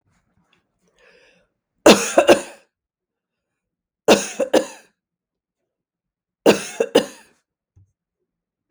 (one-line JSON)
{"three_cough_length": "8.7 s", "three_cough_amplitude": 32768, "three_cough_signal_mean_std_ratio": 0.25, "survey_phase": "beta (2021-08-13 to 2022-03-07)", "age": "65+", "gender": "Female", "wearing_mask": "No", "symptom_none": true, "smoker_status": "Never smoked", "respiratory_condition_asthma": false, "respiratory_condition_other": false, "recruitment_source": "REACT", "submission_delay": "1 day", "covid_test_result": "Negative", "covid_test_method": "RT-qPCR"}